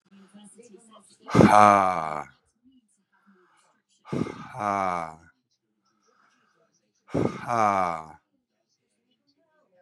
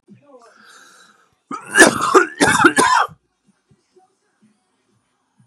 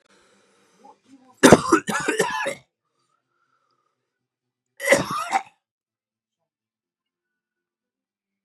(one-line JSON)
{"exhalation_length": "9.8 s", "exhalation_amplitude": 30520, "exhalation_signal_mean_std_ratio": 0.3, "cough_length": "5.5 s", "cough_amplitude": 32768, "cough_signal_mean_std_ratio": 0.35, "three_cough_length": "8.4 s", "three_cough_amplitude": 32768, "three_cough_signal_mean_std_ratio": 0.25, "survey_phase": "beta (2021-08-13 to 2022-03-07)", "age": "18-44", "gender": "Male", "wearing_mask": "No", "symptom_cough_any": true, "smoker_status": "Current smoker (1 to 10 cigarettes per day)", "respiratory_condition_asthma": false, "respiratory_condition_other": false, "recruitment_source": "Test and Trace", "submission_delay": "1 day", "covid_test_result": "Positive", "covid_test_method": "RT-qPCR", "covid_ct_value": 28.8, "covid_ct_gene": "ORF1ab gene"}